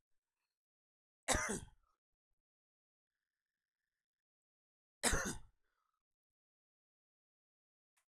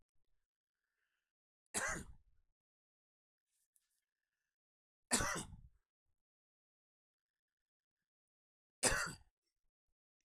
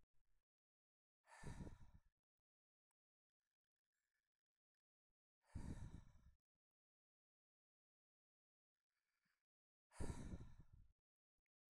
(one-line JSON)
{"cough_length": "8.2 s", "cough_amplitude": 4020, "cough_signal_mean_std_ratio": 0.21, "three_cough_length": "10.2 s", "three_cough_amplitude": 4610, "three_cough_signal_mean_std_ratio": 0.23, "exhalation_length": "11.7 s", "exhalation_amplitude": 494, "exhalation_signal_mean_std_ratio": 0.29, "survey_phase": "alpha (2021-03-01 to 2021-08-12)", "age": "45-64", "gender": "Male", "wearing_mask": "No", "symptom_none": true, "smoker_status": "Ex-smoker", "respiratory_condition_asthma": false, "respiratory_condition_other": false, "recruitment_source": "REACT", "submission_delay": "2 days", "covid_test_result": "Negative", "covid_test_method": "RT-qPCR"}